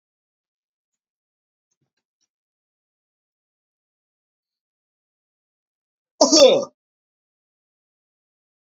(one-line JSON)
{"cough_length": "8.7 s", "cough_amplitude": 30216, "cough_signal_mean_std_ratio": 0.16, "survey_phase": "beta (2021-08-13 to 2022-03-07)", "age": "18-44", "gender": "Male", "wearing_mask": "No", "symptom_none": true, "smoker_status": "Never smoked", "respiratory_condition_asthma": false, "respiratory_condition_other": false, "recruitment_source": "Test and Trace", "submission_delay": "1 day", "covid_test_result": "Positive", "covid_test_method": "RT-qPCR", "covid_ct_value": 26.7, "covid_ct_gene": "ORF1ab gene", "covid_ct_mean": 27.1, "covid_viral_load": "1300 copies/ml", "covid_viral_load_category": "Minimal viral load (< 10K copies/ml)"}